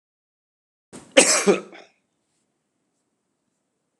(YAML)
cough_length: 4.0 s
cough_amplitude: 32767
cough_signal_mean_std_ratio: 0.23
survey_phase: beta (2021-08-13 to 2022-03-07)
age: 65+
gender: Male
wearing_mask: 'No'
symptom_cough_any: true
symptom_runny_or_blocked_nose: true
smoker_status: Never smoked
respiratory_condition_asthma: false
respiratory_condition_other: false
recruitment_source: Test and Trace
submission_delay: 2 days
covid_test_result: Positive
covid_test_method: LFT